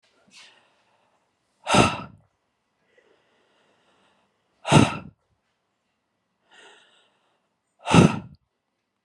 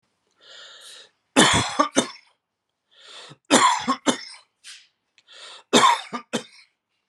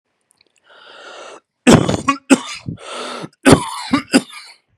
{"exhalation_length": "9.0 s", "exhalation_amplitude": 28177, "exhalation_signal_mean_std_ratio": 0.22, "three_cough_length": "7.1 s", "three_cough_amplitude": 30957, "three_cough_signal_mean_std_ratio": 0.36, "cough_length": "4.8 s", "cough_amplitude": 32768, "cough_signal_mean_std_ratio": 0.36, "survey_phase": "beta (2021-08-13 to 2022-03-07)", "age": "18-44", "gender": "Male", "wearing_mask": "No", "symptom_none": true, "smoker_status": "Never smoked", "respiratory_condition_asthma": false, "respiratory_condition_other": false, "recruitment_source": "REACT", "submission_delay": "1 day", "covid_test_result": "Negative", "covid_test_method": "RT-qPCR"}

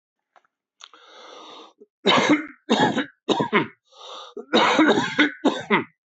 {"three_cough_length": "6.1 s", "three_cough_amplitude": 19600, "three_cough_signal_mean_std_ratio": 0.5, "survey_phase": "beta (2021-08-13 to 2022-03-07)", "age": "65+", "gender": "Male", "wearing_mask": "No", "symptom_none": true, "smoker_status": "Ex-smoker", "respiratory_condition_asthma": false, "respiratory_condition_other": false, "recruitment_source": "REACT", "submission_delay": "1 day", "covid_test_result": "Negative", "covid_test_method": "RT-qPCR"}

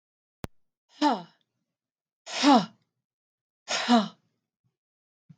{"exhalation_length": "5.4 s", "exhalation_amplitude": 16706, "exhalation_signal_mean_std_ratio": 0.29, "survey_phase": "beta (2021-08-13 to 2022-03-07)", "age": "45-64", "gender": "Female", "wearing_mask": "No", "symptom_none": true, "smoker_status": "Never smoked", "respiratory_condition_asthma": false, "respiratory_condition_other": false, "recruitment_source": "REACT", "submission_delay": "2 days", "covid_test_result": "Negative", "covid_test_method": "RT-qPCR", "influenza_a_test_result": "Negative", "influenza_b_test_result": "Negative"}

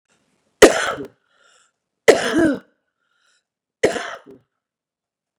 {"three_cough_length": "5.4 s", "three_cough_amplitude": 32768, "three_cough_signal_mean_std_ratio": 0.27, "survey_phase": "beta (2021-08-13 to 2022-03-07)", "age": "45-64", "gender": "Female", "wearing_mask": "No", "symptom_cough_any": true, "symptom_shortness_of_breath": true, "smoker_status": "Ex-smoker", "respiratory_condition_asthma": false, "respiratory_condition_other": true, "recruitment_source": "REACT", "submission_delay": "1 day", "covid_test_result": "Negative", "covid_test_method": "RT-qPCR", "influenza_a_test_result": "Negative", "influenza_b_test_result": "Negative"}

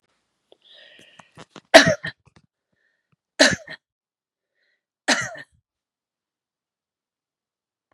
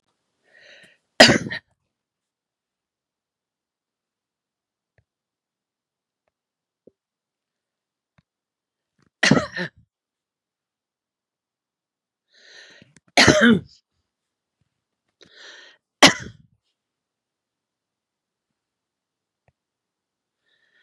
{"three_cough_length": "7.9 s", "three_cough_amplitude": 32768, "three_cough_signal_mean_std_ratio": 0.18, "cough_length": "20.8 s", "cough_amplitude": 32768, "cough_signal_mean_std_ratio": 0.17, "survey_phase": "beta (2021-08-13 to 2022-03-07)", "age": "65+", "gender": "Female", "wearing_mask": "No", "symptom_none": true, "smoker_status": "Ex-smoker", "respiratory_condition_asthma": false, "respiratory_condition_other": false, "recruitment_source": "Test and Trace", "submission_delay": "0 days", "covid_test_result": "Negative", "covid_test_method": "LFT"}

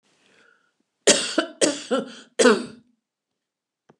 {"three_cough_length": "4.0 s", "three_cough_amplitude": 27502, "three_cough_signal_mean_std_ratio": 0.34, "survey_phase": "beta (2021-08-13 to 2022-03-07)", "age": "65+", "gender": "Female", "wearing_mask": "No", "symptom_none": true, "smoker_status": "Ex-smoker", "respiratory_condition_asthma": false, "respiratory_condition_other": false, "recruitment_source": "REACT", "submission_delay": "3 days", "covid_test_result": "Negative", "covid_test_method": "RT-qPCR"}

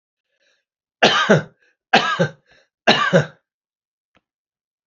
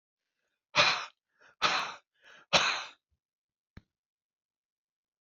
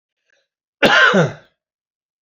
{"three_cough_length": "4.9 s", "three_cough_amplitude": 31357, "three_cough_signal_mean_std_ratio": 0.36, "exhalation_length": "5.2 s", "exhalation_amplitude": 12847, "exhalation_signal_mean_std_ratio": 0.3, "cough_length": "2.2 s", "cough_amplitude": 31966, "cough_signal_mean_std_ratio": 0.39, "survey_phase": "beta (2021-08-13 to 2022-03-07)", "age": "65+", "gender": "Male", "wearing_mask": "No", "symptom_none": true, "smoker_status": "Ex-smoker", "respiratory_condition_asthma": false, "respiratory_condition_other": false, "recruitment_source": "REACT", "submission_delay": "2 days", "covid_test_result": "Negative", "covid_test_method": "RT-qPCR"}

